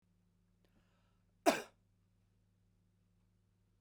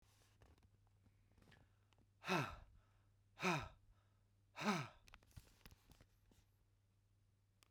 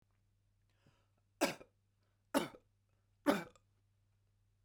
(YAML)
cough_length: 3.8 s
cough_amplitude: 6165
cough_signal_mean_std_ratio: 0.15
exhalation_length: 7.7 s
exhalation_amplitude: 1777
exhalation_signal_mean_std_ratio: 0.3
three_cough_length: 4.6 s
three_cough_amplitude: 5386
three_cough_signal_mean_std_ratio: 0.23
survey_phase: beta (2021-08-13 to 2022-03-07)
age: 18-44
gender: Male
wearing_mask: 'No'
symptom_none: true
smoker_status: Never smoked
respiratory_condition_asthma: false
respiratory_condition_other: false
recruitment_source: REACT
submission_delay: 1 day
covid_test_result: Negative
covid_test_method: RT-qPCR
influenza_a_test_result: Unknown/Void
influenza_b_test_result: Unknown/Void